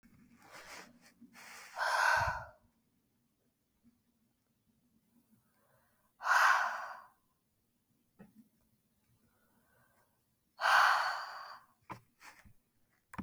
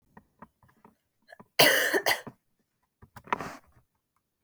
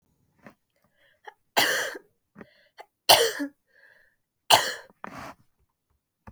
{"exhalation_length": "13.2 s", "exhalation_amplitude": 5962, "exhalation_signal_mean_std_ratio": 0.32, "cough_length": "4.4 s", "cough_amplitude": 17241, "cough_signal_mean_std_ratio": 0.29, "three_cough_length": "6.3 s", "three_cough_amplitude": 29930, "three_cough_signal_mean_std_ratio": 0.27, "survey_phase": "beta (2021-08-13 to 2022-03-07)", "age": "18-44", "gender": "Female", "wearing_mask": "No", "symptom_sore_throat": true, "symptom_change_to_sense_of_smell_or_taste": true, "symptom_loss_of_taste": true, "symptom_onset": "3 days", "smoker_status": "Never smoked", "respiratory_condition_asthma": false, "respiratory_condition_other": false, "recruitment_source": "Test and Trace", "submission_delay": "1 day", "covid_test_result": "Positive", "covid_test_method": "RT-qPCR", "covid_ct_value": 27.9, "covid_ct_gene": "ORF1ab gene"}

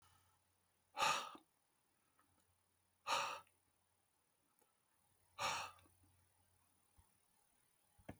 {"exhalation_length": "8.2 s", "exhalation_amplitude": 2130, "exhalation_signal_mean_std_ratio": 0.29, "survey_phase": "beta (2021-08-13 to 2022-03-07)", "age": "65+", "gender": "Male", "wearing_mask": "No", "symptom_none": true, "smoker_status": "Never smoked", "respiratory_condition_asthma": false, "respiratory_condition_other": false, "recruitment_source": "REACT", "submission_delay": "2 days", "covid_test_result": "Negative", "covid_test_method": "RT-qPCR", "influenza_a_test_result": "Negative", "influenza_b_test_result": "Negative"}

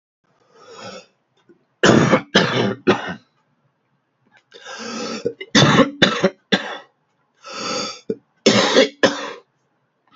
{"three_cough_length": "10.2 s", "three_cough_amplitude": 32768, "three_cough_signal_mean_std_ratio": 0.42, "survey_phase": "beta (2021-08-13 to 2022-03-07)", "age": "45-64", "gender": "Male", "wearing_mask": "No", "symptom_cough_any": true, "symptom_sore_throat": true, "symptom_headache": true, "smoker_status": "Ex-smoker", "respiratory_condition_asthma": false, "respiratory_condition_other": false, "recruitment_source": "Test and Trace", "submission_delay": "1 day", "covid_test_result": "Positive", "covid_test_method": "RT-qPCR", "covid_ct_value": 27.2, "covid_ct_gene": "N gene"}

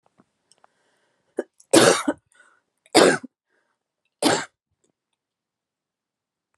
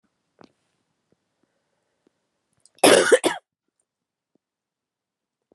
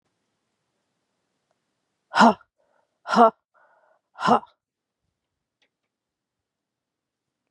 {"three_cough_length": "6.6 s", "three_cough_amplitude": 31522, "three_cough_signal_mean_std_ratio": 0.26, "cough_length": "5.5 s", "cough_amplitude": 28820, "cough_signal_mean_std_ratio": 0.2, "exhalation_length": "7.5 s", "exhalation_amplitude": 27135, "exhalation_signal_mean_std_ratio": 0.2, "survey_phase": "beta (2021-08-13 to 2022-03-07)", "age": "18-44", "gender": "Female", "wearing_mask": "No", "symptom_cough_any": true, "symptom_new_continuous_cough": true, "symptom_shortness_of_breath": true, "symptom_fatigue": true, "symptom_change_to_sense_of_smell_or_taste": true, "symptom_loss_of_taste": true, "symptom_other": true, "symptom_onset": "5 days", "smoker_status": "Never smoked", "respiratory_condition_asthma": false, "respiratory_condition_other": false, "recruitment_source": "Test and Trace", "submission_delay": "1 day", "covid_test_result": "Positive", "covid_test_method": "RT-qPCR", "covid_ct_value": 23.9, "covid_ct_gene": "N gene"}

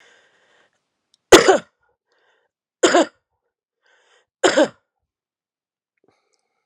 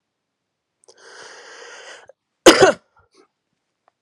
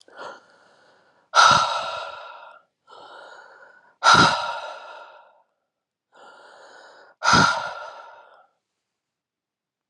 {"three_cough_length": "6.7 s", "three_cough_amplitude": 32768, "three_cough_signal_mean_std_ratio": 0.23, "cough_length": "4.0 s", "cough_amplitude": 32768, "cough_signal_mean_std_ratio": 0.21, "exhalation_length": "9.9 s", "exhalation_amplitude": 26888, "exhalation_signal_mean_std_ratio": 0.33, "survey_phase": "beta (2021-08-13 to 2022-03-07)", "age": "45-64", "gender": "Male", "wearing_mask": "No", "symptom_fatigue": true, "symptom_onset": "2 days", "smoker_status": "Never smoked", "respiratory_condition_asthma": false, "respiratory_condition_other": false, "recruitment_source": "Test and Trace", "submission_delay": "1 day", "covid_test_result": "Positive", "covid_test_method": "RT-qPCR", "covid_ct_value": 17.1, "covid_ct_gene": "ORF1ab gene"}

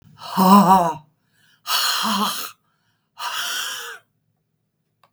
{"exhalation_length": "5.1 s", "exhalation_amplitude": 32766, "exhalation_signal_mean_std_ratio": 0.44, "survey_phase": "beta (2021-08-13 to 2022-03-07)", "age": "65+", "gender": "Female", "wearing_mask": "No", "symptom_none": true, "smoker_status": "Ex-smoker", "respiratory_condition_asthma": false, "respiratory_condition_other": false, "recruitment_source": "REACT", "submission_delay": "2 days", "covid_test_result": "Negative", "covid_test_method": "RT-qPCR", "influenza_a_test_result": "Negative", "influenza_b_test_result": "Negative"}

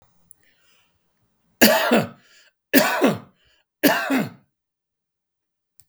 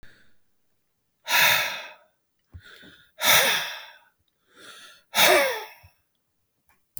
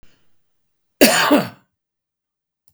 {"three_cough_length": "5.9 s", "three_cough_amplitude": 32768, "three_cough_signal_mean_std_ratio": 0.36, "exhalation_length": "7.0 s", "exhalation_amplitude": 21866, "exhalation_signal_mean_std_ratio": 0.38, "cough_length": "2.7 s", "cough_amplitude": 32768, "cough_signal_mean_std_ratio": 0.31, "survey_phase": "beta (2021-08-13 to 2022-03-07)", "age": "65+", "gender": "Male", "wearing_mask": "No", "symptom_none": true, "smoker_status": "Never smoked", "respiratory_condition_asthma": false, "respiratory_condition_other": false, "recruitment_source": "REACT", "submission_delay": "5 days", "covid_test_result": "Negative", "covid_test_method": "RT-qPCR", "influenza_a_test_result": "Negative", "influenza_b_test_result": "Negative"}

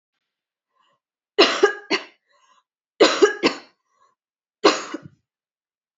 {"three_cough_length": "6.0 s", "three_cough_amplitude": 28918, "three_cough_signal_mean_std_ratio": 0.29, "survey_phase": "alpha (2021-03-01 to 2021-08-12)", "age": "18-44", "gender": "Female", "wearing_mask": "No", "symptom_cough_any": true, "symptom_fatigue": true, "symptom_headache": true, "symptom_change_to_sense_of_smell_or_taste": true, "symptom_loss_of_taste": true, "symptom_onset": "4 days", "smoker_status": "Never smoked", "respiratory_condition_asthma": false, "respiratory_condition_other": false, "recruitment_source": "Test and Trace", "submission_delay": "2 days", "covid_test_result": "Positive", "covid_test_method": "RT-qPCR", "covid_ct_value": 22.8, "covid_ct_gene": "N gene", "covid_ct_mean": 22.9, "covid_viral_load": "30000 copies/ml", "covid_viral_load_category": "Low viral load (10K-1M copies/ml)"}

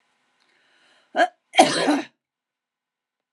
{"cough_length": "3.3 s", "cough_amplitude": 30887, "cough_signal_mean_std_ratio": 0.3, "survey_phase": "beta (2021-08-13 to 2022-03-07)", "age": "65+", "gender": "Female", "wearing_mask": "No", "symptom_none": true, "smoker_status": "Ex-smoker", "respiratory_condition_asthma": false, "respiratory_condition_other": false, "recruitment_source": "REACT", "submission_delay": "2 days", "covid_test_result": "Negative", "covid_test_method": "RT-qPCR", "influenza_a_test_result": "Negative", "influenza_b_test_result": "Negative"}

